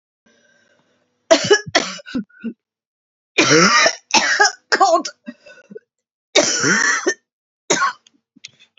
{"three_cough_length": "8.8 s", "three_cough_amplitude": 32768, "three_cough_signal_mean_std_ratio": 0.45, "survey_phase": "beta (2021-08-13 to 2022-03-07)", "age": "45-64", "gender": "Female", "wearing_mask": "No", "symptom_cough_any": true, "symptom_new_continuous_cough": true, "symptom_runny_or_blocked_nose": true, "symptom_shortness_of_breath": true, "symptom_sore_throat": true, "symptom_fatigue": true, "symptom_fever_high_temperature": true, "symptom_headache": true, "smoker_status": "Ex-smoker", "respiratory_condition_asthma": false, "respiratory_condition_other": false, "recruitment_source": "Test and Trace", "submission_delay": "1 day", "covid_test_result": "Positive", "covid_test_method": "LFT"}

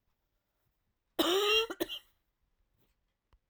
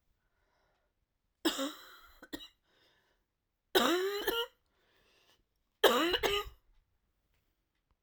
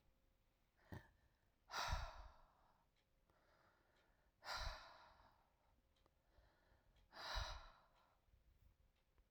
{"cough_length": "3.5 s", "cough_amplitude": 5209, "cough_signal_mean_std_ratio": 0.35, "three_cough_length": "8.0 s", "three_cough_amplitude": 9829, "three_cough_signal_mean_std_ratio": 0.34, "exhalation_length": "9.3 s", "exhalation_amplitude": 758, "exhalation_signal_mean_std_ratio": 0.37, "survey_phase": "alpha (2021-03-01 to 2021-08-12)", "age": "45-64", "gender": "Female", "wearing_mask": "No", "symptom_cough_any": true, "symptom_shortness_of_breath": true, "symptom_fatigue": true, "symptom_fever_high_temperature": true, "symptom_headache": true, "symptom_change_to_sense_of_smell_or_taste": true, "symptom_onset": "3 days", "smoker_status": "Ex-smoker", "respiratory_condition_asthma": false, "respiratory_condition_other": false, "recruitment_source": "Test and Trace", "submission_delay": "2 days", "covid_test_result": "Positive", "covid_test_method": "RT-qPCR"}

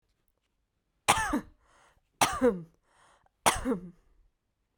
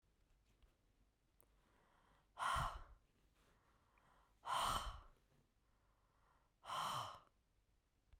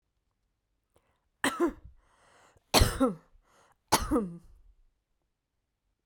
{"cough_length": "4.8 s", "cough_amplitude": 16766, "cough_signal_mean_std_ratio": 0.34, "exhalation_length": "8.2 s", "exhalation_amplitude": 1058, "exhalation_signal_mean_std_ratio": 0.37, "three_cough_length": "6.1 s", "three_cough_amplitude": 13492, "three_cough_signal_mean_std_ratio": 0.3, "survey_phase": "beta (2021-08-13 to 2022-03-07)", "age": "18-44", "gender": "Female", "wearing_mask": "No", "symptom_none": true, "smoker_status": "Never smoked", "respiratory_condition_asthma": false, "respiratory_condition_other": false, "recruitment_source": "REACT", "submission_delay": "2 days", "covid_test_result": "Negative", "covid_test_method": "RT-qPCR", "influenza_a_test_result": "Negative", "influenza_b_test_result": "Negative"}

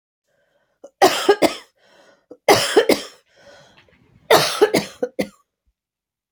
{"three_cough_length": "6.3 s", "three_cough_amplitude": 31230, "three_cough_signal_mean_std_ratio": 0.35, "survey_phase": "alpha (2021-03-01 to 2021-08-12)", "age": "65+", "gender": "Female", "wearing_mask": "No", "symptom_none": true, "smoker_status": "Ex-smoker", "respiratory_condition_asthma": false, "respiratory_condition_other": false, "recruitment_source": "REACT", "submission_delay": "2 days", "covid_test_result": "Negative", "covid_test_method": "RT-qPCR"}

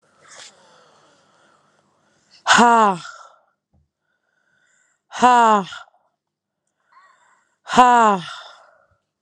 {"exhalation_length": "9.2 s", "exhalation_amplitude": 32767, "exhalation_signal_mean_std_ratio": 0.31, "survey_phase": "alpha (2021-03-01 to 2021-08-12)", "age": "18-44", "gender": "Female", "wearing_mask": "No", "symptom_cough_any": true, "symptom_shortness_of_breath": true, "symptom_abdominal_pain": true, "symptom_fever_high_temperature": true, "symptom_headache": true, "symptom_change_to_sense_of_smell_or_taste": true, "symptom_loss_of_taste": true, "symptom_onset": "3 days", "smoker_status": "Current smoker (11 or more cigarettes per day)", "respiratory_condition_asthma": false, "respiratory_condition_other": false, "recruitment_source": "Test and Trace", "submission_delay": "1 day", "covid_test_result": "Positive", "covid_test_method": "RT-qPCR"}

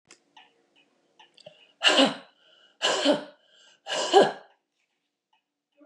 {"exhalation_length": "5.9 s", "exhalation_amplitude": 20778, "exhalation_signal_mean_std_ratio": 0.32, "survey_phase": "beta (2021-08-13 to 2022-03-07)", "age": "65+", "gender": "Female", "wearing_mask": "No", "symptom_runny_or_blocked_nose": true, "symptom_headache": true, "smoker_status": "Never smoked", "respiratory_condition_asthma": false, "respiratory_condition_other": false, "recruitment_source": "REACT", "submission_delay": "2 days", "covid_test_result": "Negative", "covid_test_method": "RT-qPCR", "influenza_a_test_result": "Negative", "influenza_b_test_result": "Negative"}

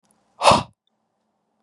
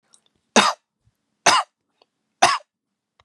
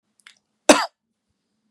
{"exhalation_length": "1.6 s", "exhalation_amplitude": 32025, "exhalation_signal_mean_std_ratio": 0.26, "three_cough_length": "3.2 s", "three_cough_amplitude": 30944, "three_cough_signal_mean_std_ratio": 0.29, "cough_length": "1.7 s", "cough_amplitude": 32768, "cough_signal_mean_std_ratio": 0.19, "survey_phase": "beta (2021-08-13 to 2022-03-07)", "age": "18-44", "gender": "Male", "wearing_mask": "No", "symptom_none": true, "smoker_status": "Never smoked", "respiratory_condition_asthma": false, "respiratory_condition_other": false, "recruitment_source": "REACT", "submission_delay": "4 days", "covid_test_result": "Negative", "covid_test_method": "RT-qPCR", "influenza_a_test_result": "Negative", "influenza_b_test_result": "Negative"}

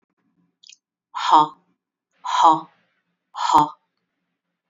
{"exhalation_length": "4.7 s", "exhalation_amplitude": 26820, "exhalation_signal_mean_std_ratio": 0.32, "survey_phase": "beta (2021-08-13 to 2022-03-07)", "age": "45-64", "gender": "Female", "wearing_mask": "No", "symptom_none": true, "smoker_status": "Never smoked", "respiratory_condition_asthma": false, "respiratory_condition_other": false, "recruitment_source": "REACT", "submission_delay": "1 day", "covid_test_result": "Negative", "covid_test_method": "RT-qPCR", "covid_ct_value": 47.0, "covid_ct_gene": "N gene"}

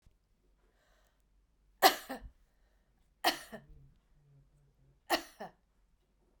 {"cough_length": "6.4 s", "cough_amplitude": 11460, "cough_signal_mean_std_ratio": 0.2, "survey_phase": "beta (2021-08-13 to 2022-03-07)", "age": "45-64", "gender": "Female", "wearing_mask": "No", "symptom_cough_any": true, "symptom_runny_or_blocked_nose": true, "symptom_fatigue": true, "symptom_headache": true, "symptom_onset": "4 days", "smoker_status": "Never smoked", "respiratory_condition_asthma": false, "respiratory_condition_other": false, "recruitment_source": "Test and Trace", "submission_delay": "2 days", "covid_test_result": "Positive", "covid_test_method": "RT-qPCR", "covid_ct_value": 23.1, "covid_ct_gene": "ORF1ab gene", "covid_ct_mean": 23.6, "covid_viral_load": "18000 copies/ml", "covid_viral_load_category": "Low viral load (10K-1M copies/ml)"}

